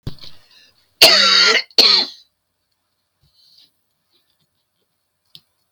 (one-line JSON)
{"cough_length": "5.7 s", "cough_amplitude": 32768, "cough_signal_mean_std_ratio": 0.33, "survey_phase": "beta (2021-08-13 to 2022-03-07)", "age": "65+", "gender": "Female", "wearing_mask": "No", "symptom_shortness_of_breath": true, "symptom_fatigue": true, "symptom_onset": "12 days", "smoker_status": "Never smoked", "respiratory_condition_asthma": false, "respiratory_condition_other": false, "recruitment_source": "REACT", "submission_delay": "1 day", "covid_test_result": "Negative", "covid_test_method": "RT-qPCR", "influenza_a_test_result": "Negative", "influenza_b_test_result": "Negative"}